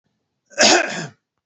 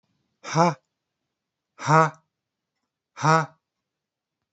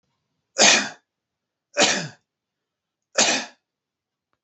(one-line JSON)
{"cough_length": "1.5 s", "cough_amplitude": 31621, "cough_signal_mean_std_ratio": 0.4, "exhalation_length": "4.5 s", "exhalation_amplitude": 20186, "exhalation_signal_mean_std_ratio": 0.29, "three_cough_length": "4.4 s", "three_cough_amplitude": 30242, "three_cough_signal_mean_std_ratio": 0.32, "survey_phase": "alpha (2021-03-01 to 2021-08-12)", "age": "45-64", "gender": "Male", "wearing_mask": "No", "symptom_none": true, "smoker_status": "Never smoked", "respiratory_condition_asthma": false, "respiratory_condition_other": false, "recruitment_source": "REACT", "submission_delay": "1 day", "covid_test_result": "Negative", "covid_test_method": "RT-qPCR"}